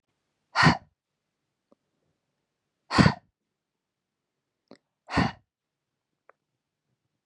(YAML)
exhalation_length: 7.3 s
exhalation_amplitude: 20430
exhalation_signal_mean_std_ratio: 0.2
survey_phase: beta (2021-08-13 to 2022-03-07)
age: 18-44
gender: Female
wearing_mask: 'No'
symptom_none: true
smoker_status: Ex-smoker
respiratory_condition_asthma: false
respiratory_condition_other: false
recruitment_source: REACT
submission_delay: 4 days
covid_test_result: Negative
covid_test_method: RT-qPCR
influenza_a_test_result: Negative
influenza_b_test_result: Negative